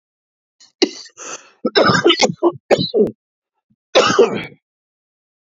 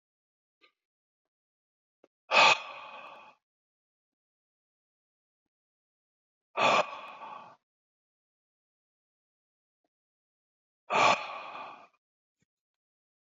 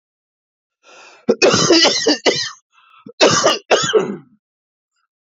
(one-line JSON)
{"three_cough_length": "5.5 s", "three_cough_amplitude": 31344, "three_cough_signal_mean_std_ratio": 0.42, "exhalation_length": "13.4 s", "exhalation_amplitude": 13996, "exhalation_signal_mean_std_ratio": 0.23, "cough_length": "5.4 s", "cough_amplitude": 32767, "cough_signal_mean_std_ratio": 0.47, "survey_phase": "beta (2021-08-13 to 2022-03-07)", "age": "45-64", "gender": "Male", "wearing_mask": "Yes", "symptom_new_continuous_cough": true, "symptom_runny_or_blocked_nose": true, "smoker_status": "Never smoked", "respiratory_condition_asthma": false, "respiratory_condition_other": false, "recruitment_source": "Test and Trace", "submission_delay": "2 days", "covid_test_result": "Positive", "covid_test_method": "RT-qPCR", "covid_ct_value": 8.9, "covid_ct_gene": "N gene"}